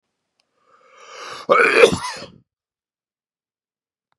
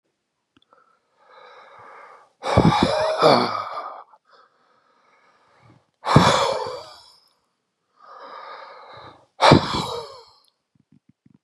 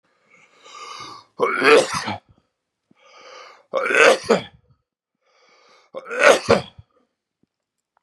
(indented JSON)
{
  "cough_length": "4.2 s",
  "cough_amplitude": 32768,
  "cough_signal_mean_std_ratio": 0.29,
  "exhalation_length": "11.4 s",
  "exhalation_amplitude": 32768,
  "exhalation_signal_mean_std_ratio": 0.35,
  "three_cough_length": "8.0 s",
  "three_cough_amplitude": 32281,
  "three_cough_signal_mean_std_ratio": 0.34,
  "survey_phase": "beta (2021-08-13 to 2022-03-07)",
  "age": "65+",
  "gender": "Male",
  "wearing_mask": "No",
  "symptom_none": true,
  "smoker_status": "Ex-smoker",
  "respiratory_condition_asthma": false,
  "respiratory_condition_other": false,
  "recruitment_source": "REACT",
  "submission_delay": "2 days",
  "covid_test_result": "Negative",
  "covid_test_method": "RT-qPCR",
  "influenza_a_test_result": "Negative",
  "influenza_b_test_result": "Negative"
}